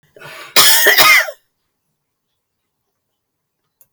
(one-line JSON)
{"cough_length": "3.9 s", "cough_amplitude": 32768, "cough_signal_mean_std_ratio": 0.37, "survey_phase": "beta (2021-08-13 to 2022-03-07)", "age": "65+", "gender": "Female", "wearing_mask": "No", "symptom_cough_any": true, "smoker_status": "Never smoked", "respiratory_condition_asthma": false, "respiratory_condition_other": false, "recruitment_source": "REACT", "submission_delay": "3 days", "covid_test_result": "Negative", "covid_test_method": "RT-qPCR"}